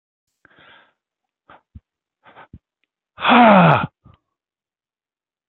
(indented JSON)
{
  "exhalation_length": "5.5 s",
  "exhalation_amplitude": 28374,
  "exhalation_signal_mean_std_ratio": 0.27,
  "survey_phase": "beta (2021-08-13 to 2022-03-07)",
  "age": "45-64",
  "gender": "Male",
  "wearing_mask": "No",
  "symptom_none": true,
  "smoker_status": "Ex-smoker",
  "respiratory_condition_asthma": false,
  "respiratory_condition_other": false,
  "recruitment_source": "REACT",
  "submission_delay": "1 day",
  "covid_test_result": "Negative",
  "covid_test_method": "RT-qPCR",
  "influenza_a_test_result": "Unknown/Void",
  "influenza_b_test_result": "Unknown/Void"
}